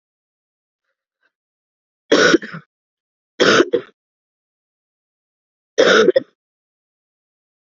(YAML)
three_cough_length: 7.8 s
three_cough_amplitude: 30188
three_cough_signal_mean_std_ratio: 0.28
survey_phase: beta (2021-08-13 to 2022-03-07)
age: 18-44
gender: Female
wearing_mask: 'No'
symptom_cough_any: true
symptom_shortness_of_breath: true
symptom_sore_throat: true
symptom_fatigue: true
symptom_headache: true
smoker_status: Never smoked
respiratory_condition_asthma: false
respiratory_condition_other: false
recruitment_source: Test and Trace
submission_delay: 2 days
covid_test_result: Positive
covid_test_method: LFT